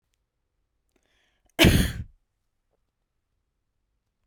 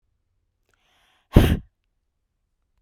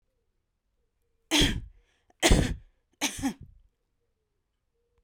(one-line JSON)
{"cough_length": "4.3 s", "cough_amplitude": 22098, "cough_signal_mean_std_ratio": 0.21, "exhalation_length": "2.8 s", "exhalation_amplitude": 32768, "exhalation_signal_mean_std_ratio": 0.2, "three_cough_length": "5.0 s", "three_cough_amplitude": 15495, "three_cough_signal_mean_std_ratio": 0.31, "survey_phase": "beta (2021-08-13 to 2022-03-07)", "age": "18-44", "gender": "Female", "wearing_mask": "No", "symptom_none": true, "smoker_status": "Never smoked", "respiratory_condition_asthma": false, "respiratory_condition_other": false, "recruitment_source": "Test and Trace", "submission_delay": "-1 day", "covid_test_result": "Negative", "covid_test_method": "LFT"}